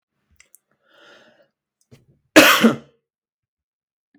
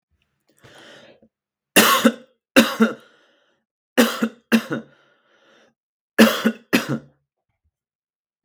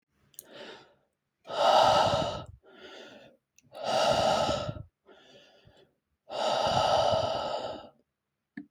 cough_length: 4.2 s
cough_amplitude: 32768
cough_signal_mean_std_ratio: 0.23
three_cough_length: 8.4 s
three_cough_amplitude: 32768
three_cough_signal_mean_std_ratio: 0.32
exhalation_length: 8.7 s
exhalation_amplitude: 10097
exhalation_signal_mean_std_ratio: 0.53
survey_phase: beta (2021-08-13 to 2022-03-07)
age: 18-44
gender: Male
wearing_mask: 'No'
symptom_cough_any: true
symptom_runny_or_blocked_nose: true
symptom_sore_throat: true
symptom_fatigue: true
symptom_headache: true
smoker_status: Never smoked
respiratory_condition_asthma: false
respiratory_condition_other: false
recruitment_source: Test and Trace
submission_delay: 2 days
covid_test_result: Positive
covid_test_method: LFT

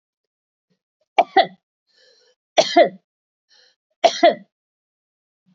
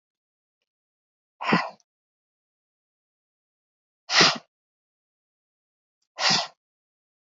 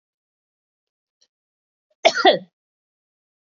three_cough_length: 5.5 s
three_cough_amplitude: 29012
three_cough_signal_mean_std_ratio: 0.25
exhalation_length: 7.3 s
exhalation_amplitude: 22589
exhalation_signal_mean_std_ratio: 0.23
cough_length: 3.6 s
cough_amplitude: 27906
cough_signal_mean_std_ratio: 0.2
survey_phase: beta (2021-08-13 to 2022-03-07)
age: 45-64
gender: Female
wearing_mask: 'No'
symptom_headache: true
smoker_status: Never smoked
respiratory_condition_asthma: true
respiratory_condition_other: false
recruitment_source: REACT
submission_delay: 2 days
covid_test_result: Negative
covid_test_method: RT-qPCR
influenza_a_test_result: Negative
influenza_b_test_result: Negative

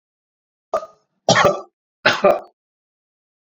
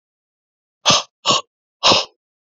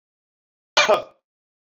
three_cough_length: 3.5 s
three_cough_amplitude: 29485
three_cough_signal_mean_std_ratio: 0.33
exhalation_length: 2.6 s
exhalation_amplitude: 32768
exhalation_signal_mean_std_ratio: 0.35
cough_length: 1.8 s
cough_amplitude: 23253
cough_signal_mean_std_ratio: 0.27
survey_phase: beta (2021-08-13 to 2022-03-07)
age: 45-64
gender: Male
wearing_mask: 'No'
symptom_none: true
symptom_onset: 12 days
smoker_status: Ex-smoker
respiratory_condition_asthma: false
respiratory_condition_other: false
recruitment_source: REACT
submission_delay: 1 day
covid_test_result: Negative
covid_test_method: RT-qPCR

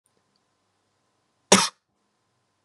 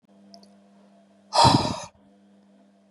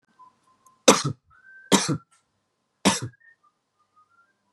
cough_length: 2.6 s
cough_amplitude: 31503
cough_signal_mean_std_ratio: 0.17
exhalation_length: 2.9 s
exhalation_amplitude: 22192
exhalation_signal_mean_std_ratio: 0.31
three_cough_length: 4.5 s
three_cough_amplitude: 30061
three_cough_signal_mean_std_ratio: 0.26
survey_phase: beta (2021-08-13 to 2022-03-07)
age: 18-44
gender: Male
wearing_mask: 'No'
symptom_runny_or_blocked_nose: true
symptom_onset: 3 days
smoker_status: Current smoker (e-cigarettes or vapes only)
respiratory_condition_asthma: false
respiratory_condition_other: false
recruitment_source: Test and Trace
submission_delay: 2 days
covid_test_result: Positive
covid_test_method: RT-qPCR
covid_ct_value: 24.1
covid_ct_gene: ORF1ab gene
covid_ct_mean: 24.6
covid_viral_load: 8600 copies/ml
covid_viral_load_category: Minimal viral load (< 10K copies/ml)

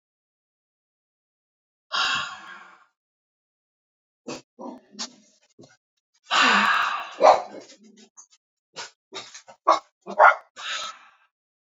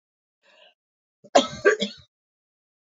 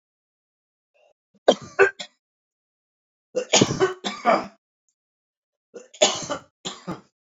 exhalation_length: 11.7 s
exhalation_amplitude: 26027
exhalation_signal_mean_std_ratio: 0.3
cough_length: 2.8 s
cough_amplitude: 26265
cough_signal_mean_std_ratio: 0.24
three_cough_length: 7.3 s
three_cough_amplitude: 26248
three_cough_signal_mean_std_ratio: 0.3
survey_phase: alpha (2021-03-01 to 2021-08-12)
age: 45-64
gender: Male
wearing_mask: 'No'
symptom_none: true
smoker_status: Current smoker (e-cigarettes or vapes only)
respiratory_condition_asthma: false
respiratory_condition_other: false
recruitment_source: REACT
submission_delay: 1 day
covid_test_result: Negative
covid_test_method: RT-qPCR
covid_ct_value: 43.0
covid_ct_gene: N gene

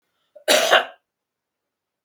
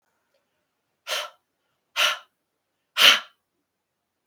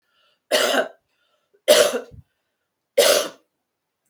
cough_length: 2.0 s
cough_amplitude: 32766
cough_signal_mean_std_ratio: 0.32
exhalation_length: 4.3 s
exhalation_amplitude: 30352
exhalation_signal_mean_std_ratio: 0.25
three_cough_length: 4.1 s
three_cough_amplitude: 28012
three_cough_signal_mean_std_ratio: 0.38
survey_phase: beta (2021-08-13 to 2022-03-07)
age: 65+
gender: Female
wearing_mask: 'No'
symptom_none: true
smoker_status: Ex-smoker
respiratory_condition_asthma: false
respiratory_condition_other: false
recruitment_source: REACT
submission_delay: 1 day
covid_test_result: Negative
covid_test_method: RT-qPCR
influenza_a_test_result: Negative
influenza_b_test_result: Negative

